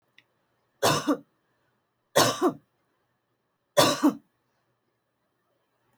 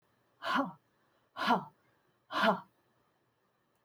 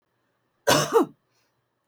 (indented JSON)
{
  "three_cough_length": "6.0 s",
  "three_cough_amplitude": 17715,
  "three_cough_signal_mean_std_ratio": 0.3,
  "exhalation_length": "3.8 s",
  "exhalation_amplitude": 5728,
  "exhalation_signal_mean_std_ratio": 0.35,
  "cough_length": "1.9 s",
  "cough_amplitude": 22995,
  "cough_signal_mean_std_ratio": 0.34,
  "survey_phase": "alpha (2021-03-01 to 2021-08-12)",
  "age": "65+",
  "gender": "Female",
  "wearing_mask": "No",
  "symptom_none": true,
  "smoker_status": "Never smoked",
  "respiratory_condition_asthma": false,
  "respiratory_condition_other": false,
  "recruitment_source": "REACT",
  "submission_delay": "2 days",
  "covid_test_result": "Negative",
  "covid_test_method": "RT-qPCR"
}